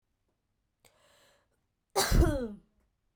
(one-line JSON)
{"cough_length": "3.2 s", "cough_amplitude": 9292, "cough_signal_mean_std_ratio": 0.31, "survey_phase": "beta (2021-08-13 to 2022-03-07)", "age": "18-44", "gender": "Female", "wearing_mask": "No", "symptom_cough_any": true, "symptom_new_continuous_cough": true, "symptom_runny_or_blocked_nose": true, "symptom_sore_throat": true, "symptom_fatigue": true, "symptom_fever_high_temperature": true, "symptom_onset": "7 days", "smoker_status": "Ex-smoker", "respiratory_condition_asthma": false, "respiratory_condition_other": false, "recruitment_source": "Test and Trace", "submission_delay": "1 day", "covid_test_result": "Positive", "covid_test_method": "RT-qPCR", "covid_ct_value": 18.2, "covid_ct_gene": "ORF1ab gene", "covid_ct_mean": 18.6, "covid_viral_load": "810000 copies/ml", "covid_viral_load_category": "Low viral load (10K-1M copies/ml)"}